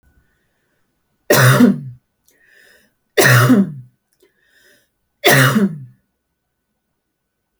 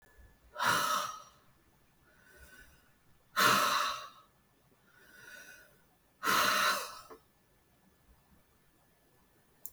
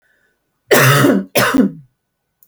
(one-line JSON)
{"three_cough_length": "7.6 s", "three_cough_amplitude": 32768, "three_cough_signal_mean_std_ratio": 0.38, "exhalation_length": "9.7 s", "exhalation_amplitude": 7316, "exhalation_signal_mean_std_ratio": 0.38, "cough_length": "2.5 s", "cough_amplitude": 32768, "cough_signal_mean_std_ratio": 0.53, "survey_phase": "beta (2021-08-13 to 2022-03-07)", "age": "65+", "gender": "Female", "wearing_mask": "No", "symptom_none": true, "smoker_status": "Never smoked", "respiratory_condition_asthma": true, "respiratory_condition_other": false, "recruitment_source": "REACT", "submission_delay": "2 days", "covid_test_result": "Negative", "covid_test_method": "RT-qPCR", "influenza_a_test_result": "Negative", "influenza_b_test_result": "Negative"}